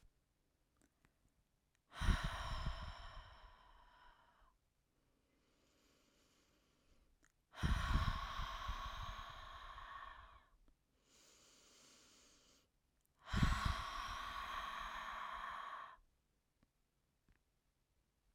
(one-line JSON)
{"exhalation_length": "18.3 s", "exhalation_amplitude": 2857, "exhalation_signal_mean_std_ratio": 0.42, "survey_phase": "alpha (2021-03-01 to 2021-08-12)", "age": "45-64", "gender": "Female", "wearing_mask": "No", "symptom_none": true, "smoker_status": "Never smoked", "respiratory_condition_asthma": false, "respiratory_condition_other": false, "recruitment_source": "REACT", "submission_delay": "2 days", "covid_test_result": "Negative", "covid_test_method": "RT-qPCR"}